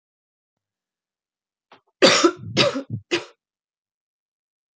{
  "three_cough_length": "4.8 s",
  "three_cough_amplitude": 28609,
  "three_cough_signal_mean_std_ratio": 0.28,
  "survey_phase": "beta (2021-08-13 to 2022-03-07)",
  "age": "18-44",
  "gender": "Female",
  "wearing_mask": "No",
  "symptom_cough_any": true,
  "symptom_new_continuous_cough": true,
  "symptom_runny_or_blocked_nose": true,
  "symptom_sore_throat": true,
  "symptom_fatigue": true,
  "symptom_onset": "4 days",
  "smoker_status": "Never smoked",
  "respiratory_condition_asthma": false,
  "respiratory_condition_other": false,
  "recruitment_source": "Test and Trace",
  "submission_delay": "2 days",
  "covid_test_result": "Positive",
  "covid_test_method": "RT-qPCR",
  "covid_ct_value": 34.0,
  "covid_ct_gene": "N gene"
}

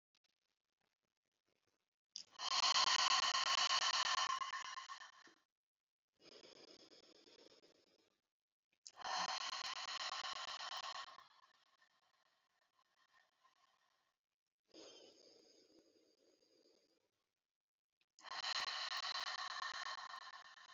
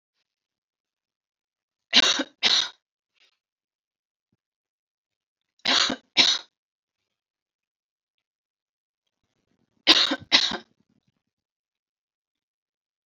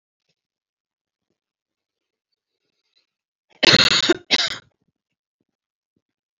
{
  "exhalation_length": "20.7 s",
  "exhalation_amplitude": 2571,
  "exhalation_signal_mean_std_ratio": 0.4,
  "three_cough_length": "13.1 s",
  "three_cough_amplitude": 29946,
  "three_cough_signal_mean_std_ratio": 0.24,
  "cough_length": "6.4 s",
  "cough_amplitude": 31909,
  "cough_signal_mean_std_ratio": 0.23,
  "survey_phase": "alpha (2021-03-01 to 2021-08-12)",
  "age": "18-44",
  "gender": "Female",
  "wearing_mask": "No",
  "symptom_headache": true,
  "symptom_onset": "12 days",
  "smoker_status": "Never smoked",
  "respiratory_condition_asthma": true,
  "respiratory_condition_other": false,
  "recruitment_source": "REACT",
  "submission_delay": "1 day",
  "covid_test_result": "Negative",
  "covid_test_method": "RT-qPCR"
}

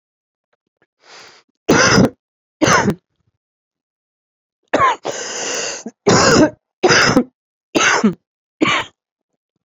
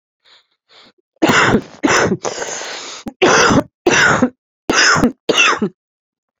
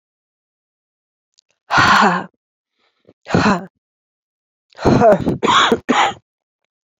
{
  "three_cough_length": "9.6 s",
  "three_cough_amplitude": 30311,
  "three_cough_signal_mean_std_ratio": 0.44,
  "cough_length": "6.4 s",
  "cough_amplitude": 32237,
  "cough_signal_mean_std_ratio": 0.57,
  "exhalation_length": "7.0 s",
  "exhalation_amplitude": 29559,
  "exhalation_signal_mean_std_ratio": 0.42,
  "survey_phase": "beta (2021-08-13 to 2022-03-07)",
  "age": "65+",
  "gender": "Male",
  "wearing_mask": "Yes",
  "symptom_cough_any": true,
  "symptom_abdominal_pain": true,
  "symptom_loss_of_taste": true,
  "symptom_onset": "5 days",
  "smoker_status": "Never smoked",
  "respiratory_condition_asthma": false,
  "respiratory_condition_other": false,
  "recruitment_source": "Test and Trace",
  "submission_delay": "1 day",
  "covid_test_result": "Positive",
  "covid_test_method": "RT-qPCR",
  "covid_ct_value": 13.7,
  "covid_ct_gene": "ORF1ab gene",
  "covid_ct_mean": 14.0,
  "covid_viral_load": "26000000 copies/ml",
  "covid_viral_load_category": "High viral load (>1M copies/ml)"
}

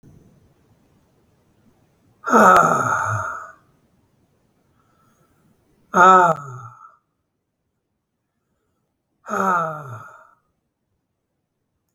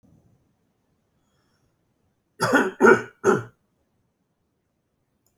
{
  "exhalation_length": "11.9 s",
  "exhalation_amplitude": 28574,
  "exhalation_signal_mean_std_ratio": 0.31,
  "cough_length": "5.4 s",
  "cough_amplitude": 25519,
  "cough_signal_mean_std_ratio": 0.26,
  "survey_phase": "beta (2021-08-13 to 2022-03-07)",
  "age": "65+",
  "gender": "Male",
  "wearing_mask": "No",
  "symptom_none": true,
  "symptom_onset": "12 days",
  "smoker_status": "Never smoked",
  "respiratory_condition_asthma": false,
  "respiratory_condition_other": false,
  "recruitment_source": "REACT",
  "submission_delay": "1 day",
  "covid_test_result": "Negative",
  "covid_test_method": "RT-qPCR"
}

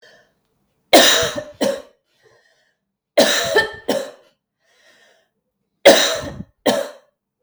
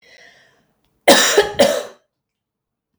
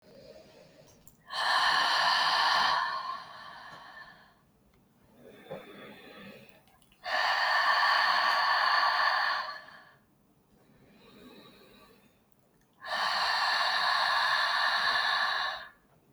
{
  "three_cough_length": "7.4 s",
  "three_cough_amplitude": 32768,
  "three_cough_signal_mean_std_ratio": 0.37,
  "cough_length": "3.0 s",
  "cough_amplitude": 32768,
  "cough_signal_mean_std_ratio": 0.36,
  "exhalation_length": "16.1 s",
  "exhalation_amplitude": 7047,
  "exhalation_signal_mean_std_ratio": 0.64,
  "survey_phase": "beta (2021-08-13 to 2022-03-07)",
  "age": "45-64",
  "gender": "Female",
  "wearing_mask": "No",
  "symptom_none": true,
  "smoker_status": "Ex-smoker",
  "respiratory_condition_asthma": false,
  "respiratory_condition_other": false,
  "recruitment_source": "REACT",
  "submission_delay": "3 days",
  "covid_test_result": "Negative",
  "covid_test_method": "RT-qPCR",
  "influenza_a_test_result": "Negative",
  "influenza_b_test_result": "Negative"
}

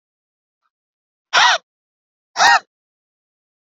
{
  "exhalation_length": "3.7 s",
  "exhalation_amplitude": 30199,
  "exhalation_signal_mean_std_ratio": 0.28,
  "survey_phase": "beta (2021-08-13 to 2022-03-07)",
  "age": "18-44",
  "gender": "Female",
  "wearing_mask": "No",
  "symptom_runny_or_blocked_nose": true,
  "symptom_sore_throat": true,
  "symptom_fatigue": true,
  "symptom_headache": true,
  "symptom_other": true,
  "smoker_status": "Ex-smoker",
  "respiratory_condition_asthma": false,
  "respiratory_condition_other": false,
  "recruitment_source": "Test and Trace",
  "submission_delay": "1 day",
  "covid_test_result": "Positive",
  "covid_test_method": "RT-qPCR",
  "covid_ct_value": 27.7,
  "covid_ct_gene": "N gene",
  "covid_ct_mean": 28.0,
  "covid_viral_load": "660 copies/ml",
  "covid_viral_load_category": "Minimal viral load (< 10K copies/ml)"
}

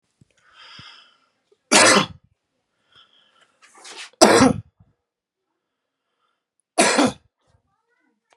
{
  "three_cough_length": "8.4 s",
  "three_cough_amplitude": 32768,
  "three_cough_signal_mean_std_ratio": 0.28,
  "survey_phase": "beta (2021-08-13 to 2022-03-07)",
  "age": "18-44",
  "gender": "Male",
  "wearing_mask": "No",
  "symptom_none": true,
  "smoker_status": "Ex-smoker",
  "respiratory_condition_asthma": false,
  "respiratory_condition_other": false,
  "recruitment_source": "REACT",
  "submission_delay": "1 day",
  "covid_test_result": "Negative",
  "covid_test_method": "RT-qPCR"
}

